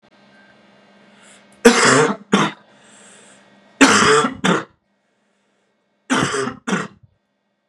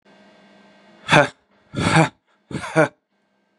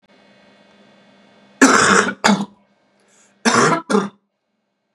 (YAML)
three_cough_length: 7.7 s
three_cough_amplitude: 32768
three_cough_signal_mean_std_ratio: 0.39
exhalation_length: 3.6 s
exhalation_amplitude: 32767
exhalation_signal_mean_std_ratio: 0.33
cough_length: 4.9 s
cough_amplitude: 32768
cough_signal_mean_std_ratio: 0.4
survey_phase: beta (2021-08-13 to 2022-03-07)
age: 18-44
gender: Male
wearing_mask: 'No'
symptom_runny_or_blocked_nose: true
symptom_sore_throat: true
symptom_fatigue: true
symptom_headache: true
symptom_onset: 3 days
smoker_status: Ex-smoker
respiratory_condition_asthma: true
respiratory_condition_other: false
recruitment_source: Test and Trace
submission_delay: 1 day
covid_test_result: Positive
covid_test_method: RT-qPCR
covid_ct_value: 15.7
covid_ct_gene: ORF1ab gene
covid_ct_mean: 15.7
covid_viral_load: 6900000 copies/ml
covid_viral_load_category: High viral load (>1M copies/ml)